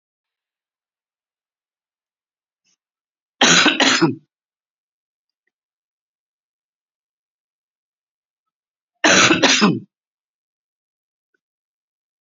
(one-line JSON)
{"cough_length": "12.2 s", "cough_amplitude": 31459, "cough_signal_mean_std_ratio": 0.27, "survey_phase": "beta (2021-08-13 to 2022-03-07)", "age": "45-64", "gender": "Female", "wearing_mask": "No", "symptom_none": true, "smoker_status": "Ex-smoker", "respiratory_condition_asthma": false, "respiratory_condition_other": false, "recruitment_source": "REACT", "submission_delay": "5 days", "covid_test_result": "Negative", "covid_test_method": "RT-qPCR", "influenza_a_test_result": "Negative", "influenza_b_test_result": "Negative"}